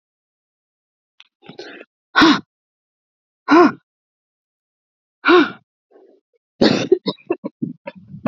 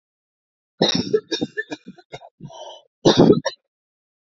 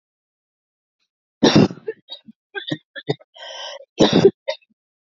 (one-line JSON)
{"exhalation_length": "8.3 s", "exhalation_amplitude": 32122, "exhalation_signal_mean_std_ratio": 0.3, "cough_length": "4.4 s", "cough_amplitude": 29148, "cough_signal_mean_std_ratio": 0.34, "three_cough_length": "5.0 s", "three_cough_amplitude": 30790, "three_cough_signal_mean_std_ratio": 0.31, "survey_phase": "beta (2021-08-13 to 2022-03-07)", "age": "45-64", "gender": "Female", "wearing_mask": "No", "symptom_shortness_of_breath": true, "symptom_diarrhoea": true, "symptom_fatigue": true, "symptom_fever_high_temperature": true, "symptom_headache": true, "symptom_onset": "5 days", "smoker_status": "Never smoked", "respiratory_condition_asthma": true, "respiratory_condition_other": true, "recruitment_source": "Test and Trace", "submission_delay": "3 days", "covid_test_result": "Negative", "covid_test_method": "RT-qPCR"}